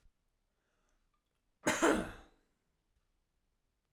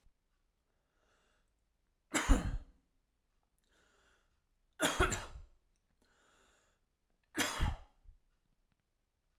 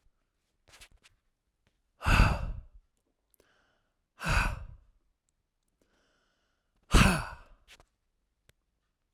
cough_length: 3.9 s
cough_amplitude: 5438
cough_signal_mean_std_ratio: 0.25
three_cough_length: 9.4 s
three_cough_amplitude: 7077
three_cough_signal_mean_std_ratio: 0.27
exhalation_length: 9.1 s
exhalation_amplitude: 13386
exhalation_signal_mean_std_ratio: 0.26
survey_phase: alpha (2021-03-01 to 2021-08-12)
age: 18-44
gender: Male
wearing_mask: 'No'
symptom_none: true
symptom_onset: 3 days
smoker_status: Never smoked
respiratory_condition_asthma: false
respiratory_condition_other: false
recruitment_source: REACT
submission_delay: 1 day
covid_test_result: Negative
covid_test_method: RT-qPCR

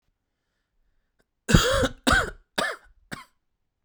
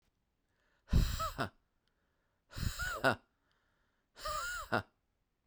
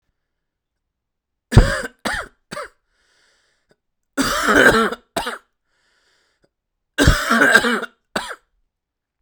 cough_length: 3.8 s
cough_amplitude: 32004
cough_signal_mean_std_ratio: 0.34
exhalation_length: 5.5 s
exhalation_amplitude: 5642
exhalation_signal_mean_std_ratio: 0.38
three_cough_length: 9.2 s
three_cough_amplitude: 32768
three_cough_signal_mean_std_ratio: 0.36
survey_phase: beta (2021-08-13 to 2022-03-07)
age: 18-44
gender: Male
wearing_mask: 'No'
symptom_cough_any: true
symptom_new_continuous_cough: true
symptom_runny_or_blocked_nose: true
symptom_shortness_of_breath: true
symptom_sore_throat: true
symptom_fatigue: true
symptom_fever_high_temperature: true
symptom_headache: true
symptom_change_to_sense_of_smell_or_taste: true
symptom_loss_of_taste: true
symptom_onset: 4 days
smoker_status: Never smoked
respiratory_condition_asthma: false
respiratory_condition_other: true
recruitment_source: Test and Trace
submission_delay: 1 day
covid_test_result: Positive
covid_test_method: RT-qPCR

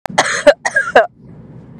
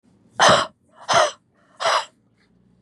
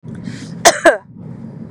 three_cough_length: 1.8 s
three_cough_amplitude: 32768
three_cough_signal_mean_std_ratio: 0.46
exhalation_length: 2.8 s
exhalation_amplitude: 25042
exhalation_signal_mean_std_ratio: 0.4
cough_length: 1.7 s
cough_amplitude: 32768
cough_signal_mean_std_ratio: 0.41
survey_phase: beta (2021-08-13 to 2022-03-07)
age: 18-44
gender: Female
wearing_mask: 'No'
symptom_none: true
smoker_status: Never smoked
respiratory_condition_asthma: true
respiratory_condition_other: false
recruitment_source: REACT
submission_delay: 4 days
covid_test_result: Negative
covid_test_method: RT-qPCR
influenza_a_test_result: Negative
influenza_b_test_result: Negative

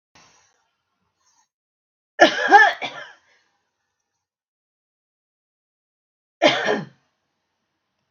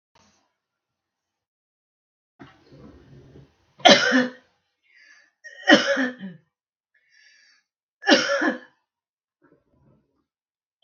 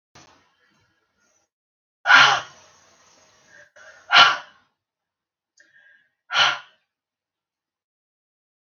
cough_length: 8.1 s
cough_amplitude: 32768
cough_signal_mean_std_ratio: 0.23
three_cough_length: 10.8 s
three_cough_amplitude: 32768
three_cough_signal_mean_std_ratio: 0.26
exhalation_length: 8.8 s
exhalation_amplitude: 32768
exhalation_signal_mean_std_ratio: 0.23
survey_phase: beta (2021-08-13 to 2022-03-07)
age: 65+
gender: Female
wearing_mask: 'No'
symptom_none: true
smoker_status: Never smoked
respiratory_condition_asthma: false
respiratory_condition_other: false
recruitment_source: REACT
submission_delay: 1 day
covid_test_result: Negative
covid_test_method: RT-qPCR
influenza_a_test_result: Negative
influenza_b_test_result: Negative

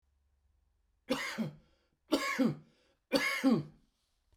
three_cough_length: 4.4 s
three_cough_amplitude: 6639
three_cough_signal_mean_std_ratio: 0.43
survey_phase: beta (2021-08-13 to 2022-03-07)
age: 65+
gender: Male
wearing_mask: 'No'
symptom_none: true
smoker_status: Ex-smoker
respiratory_condition_asthma: true
respiratory_condition_other: false
recruitment_source: REACT
submission_delay: 1 day
covid_test_result: Negative
covid_test_method: RT-qPCR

